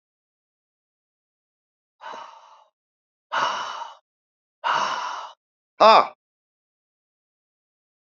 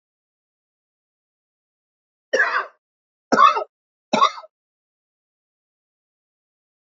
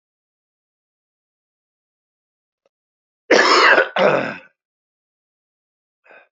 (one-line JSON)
{"exhalation_length": "8.1 s", "exhalation_amplitude": 27688, "exhalation_signal_mean_std_ratio": 0.25, "three_cough_length": "6.9 s", "three_cough_amplitude": 27217, "three_cough_signal_mean_std_ratio": 0.24, "cough_length": "6.3 s", "cough_amplitude": 29119, "cough_signal_mean_std_ratio": 0.3, "survey_phase": "beta (2021-08-13 to 2022-03-07)", "age": "45-64", "gender": "Male", "wearing_mask": "Yes", "symptom_prefer_not_to_say": true, "smoker_status": "Current smoker (1 to 10 cigarettes per day)", "respiratory_condition_asthma": false, "respiratory_condition_other": false, "recruitment_source": "REACT", "submission_delay": "2 days", "covid_test_result": "Negative", "covid_test_method": "RT-qPCR"}